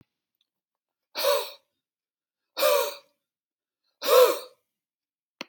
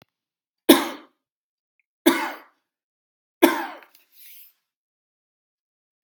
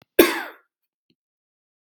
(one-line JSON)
{"exhalation_length": "5.5 s", "exhalation_amplitude": 16709, "exhalation_signal_mean_std_ratio": 0.32, "three_cough_length": "6.0 s", "three_cough_amplitude": 32767, "three_cough_signal_mean_std_ratio": 0.22, "cough_length": "1.9 s", "cough_amplitude": 32768, "cough_signal_mean_std_ratio": 0.22, "survey_phase": "beta (2021-08-13 to 2022-03-07)", "age": "45-64", "gender": "Male", "wearing_mask": "No", "symptom_runny_or_blocked_nose": true, "symptom_fatigue": true, "smoker_status": "Never smoked", "respiratory_condition_asthma": false, "respiratory_condition_other": false, "recruitment_source": "Test and Trace", "submission_delay": "1 day", "covid_test_result": "Negative", "covid_test_method": "RT-qPCR"}